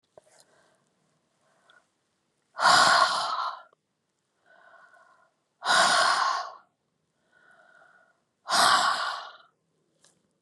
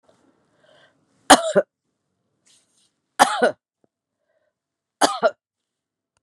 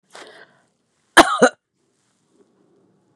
{"exhalation_length": "10.4 s", "exhalation_amplitude": 15412, "exhalation_signal_mean_std_ratio": 0.39, "three_cough_length": "6.2 s", "three_cough_amplitude": 32768, "three_cough_signal_mean_std_ratio": 0.23, "cough_length": "3.2 s", "cough_amplitude": 32768, "cough_signal_mean_std_ratio": 0.21, "survey_phase": "beta (2021-08-13 to 2022-03-07)", "age": "65+", "gender": "Female", "wearing_mask": "No", "symptom_runny_or_blocked_nose": true, "symptom_diarrhoea": true, "symptom_change_to_sense_of_smell_or_taste": true, "symptom_onset": "4 days", "smoker_status": "Never smoked", "respiratory_condition_asthma": false, "respiratory_condition_other": false, "recruitment_source": "Test and Trace", "submission_delay": "1 day", "covid_test_result": "Positive", "covid_test_method": "RT-qPCR"}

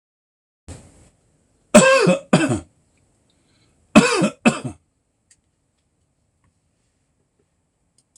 {"cough_length": "8.2 s", "cough_amplitude": 26028, "cough_signal_mean_std_ratio": 0.29, "survey_phase": "alpha (2021-03-01 to 2021-08-12)", "age": "65+", "gender": "Male", "wearing_mask": "No", "symptom_none": true, "symptom_shortness_of_breath": true, "smoker_status": "Ex-smoker", "respiratory_condition_asthma": false, "respiratory_condition_other": false, "recruitment_source": "REACT", "submission_delay": "2 days", "covid_test_result": "Negative", "covid_test_method": "RT-qPCR"}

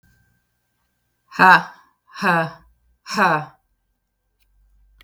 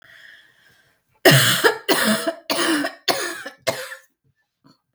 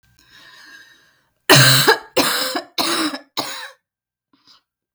{"exhalation_length": "5.0 s", "exhalation_amplitude": 32768, "exhalation_signal_mean_std_ratio": 0.3, "three_cough_length": "4.9 s", "three_cough_amplitude": 32766, "three_cough_signal_mean_std_ratio": 0.46, "cough_length": "4.9 s", "cough_amplitude": 32768, "cough_signal_mean_std_ratio": 0.4, "survey_phase": "beta (2021-08-13 to 2022-03-07)", "age": "45-64", "gender": "Female", "wearing_mask": "No", "symptom_cough_any": true, "symptom_new_continuous_cough": true, "symptom_shortness_of_breath": true, "symptom_onset": "3 days", "smoker_status": "Never smoked", "respiratory_condition_asthma": false, "respiratory_condition_other": false, "recruitment_source": "Test and Trace", "submission_delay": "1 day", "covid_test_result": "Negative", "covid_test_method": "RT-qPCR"}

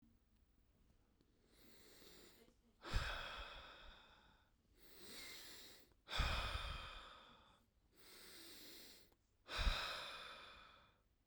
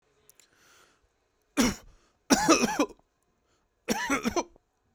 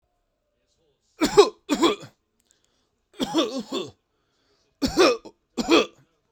{"exhalation_length": "11.3 s", "exhalation_amplitude": 1745, "exhalation_signal_mean_std_ratio": 0.45, "cough_length": "4.9 s", "cough_amplitude": 19858, "cough_signal_mean_std_ratio": 0.36, "three_cough_length": "6.3 s", "three_cough_amplitude": 28673, "three_cough_signal_mean_std_ratio": 0.35, "survey_phase": "beta (2021-08-13 to 2022-03-07)", "age": "18-44", "gender": "Male", "wearing_mask": "No", "symptom_none": true, "smoker_status": "Never smoked", "respiratory_condition_asthma": false, "respiratory_condition_other": false, "recruitment_source": "REACT", "submission_delay": "2 days", "covid_test_result": "Negative", "covid_test_method": "RT-qPCR"}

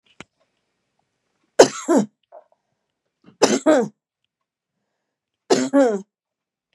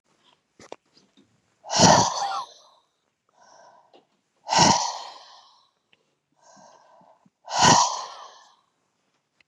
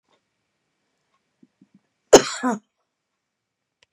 {"three_cough_length": "6.7 s", "three_cough_amplitude": 32768, "three_cough_signal_mean_std_ratio": 0.3, "exhalation_length": "9.5 s", "exhalation_amplitude": 28405, "exhalation_signal_mean_std_ratio": 0.32, "cough_length": "3.9 s", "cough_amplitude": 32768, "cough_signal_mean_std_ratio": 0.16, "survey_phase": "beta (2021-08-13 to 2022-03-07)", "age": "18-44", "gender": "Female", "wearing_mask": "No", "symptom_none": true, "symptom_onset": "12 days", "smoker_status": "Ex-smoker", "respiratory_condition_asthma": true, "respiratory_condition_other": false, "recruitment_source": "REACT", "submission_delay": "6 days", "covid_test_result": "Negative", "covid_test_method": "RT-qPCR"}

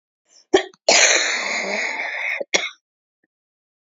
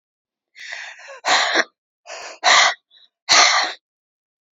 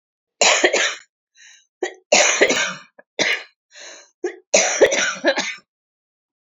{"cough_length": "3.9 s", "cough_amplitude": 28579, "cough_signal_mean_std_ratio": 0.49, "exhalation_length": "4.5 s", "exhalation_amplitude": 32768, "exhalation_signal_mean_std_ratio": 0.42, "three_cough_length": "6.5 s", "three_cough_amplitude": 31880, "three_cough_signal_mean_std_ratio": 0.47, "survey_phase": "beta (2021-08-13 to 2022-03-07)", "age": "45-64", "gender": "Female", "wearing_mask": "No", "symptom_cough_any": true, "symptom_runny_or_blocked_nose": true, "symptom_sore_throat": true, "symptom_onset": "3 days", "smoker_status": "Ex-smoker", "respiratory_condition_asthma": true, "respiratory_condition_other": false, "recruitment_source": "Test and Trace", "submission_delay": "2 days", "covid_test_result": "Negative", "covid_test_method": "RT-qPCR"}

